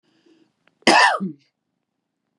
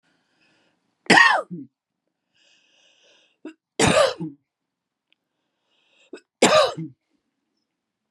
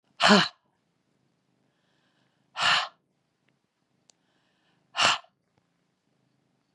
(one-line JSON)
{"cough_length": "2.4 s", "cough_amplitude": 31049, "cough_signal_mean_std_ratio": 0.31, "three_cough_length": "8.1 s", "three_cough_amplitude": 30806, "three_cough_signal_mean_std_ratio": 0.29, "exhalation_length": "6.7 s", "exhalation_amplitude": 20934, "exhalation_signal_mean_std_ratio": 0.25, "survey_phase": "beta (2021-08-13 to 2022-03-07)", "age": "45-64", "gender": "Female", "wearing_mask": "No", "symptom_none": true, "smoker_status": "Never smoked", "respiratory_condition_asthma": false, "respiratory_condition_other": false, "recruitment_source": "REACT", "submission_delay": "2 days", "covid_test_result": "Negative", "covid_test_method": "RT-qPCR", "influenza_a_test_result": "Negative", "influenza_b_test_result": "Negative"}